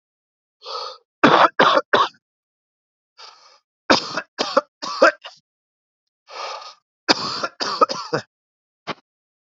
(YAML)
three_cough_length: 9.6 s
three_cough_amplitude: 29518
three_cough_signal_mean_std_ratio: 0.34
survey_phase: beta (2021-08-13 to 2022-03-07)
age: 45-64
gender: Male
wearing_mask: 'No'
symptom_cough_any: true
symptom_runny_or_blocked_nose: true
symptom_sore_throat: true
symptom_fatigue: true
symptom_headache: true
symptom_onset: 2 days
smoker_status: Never smoked
respiratory_condition_asthma: false
respiratory_condition_other: false
recruitment_source: Test and Trace
submission_delay: 2 days
covid_test_result: Positive
covid_test_method: RT-qPCR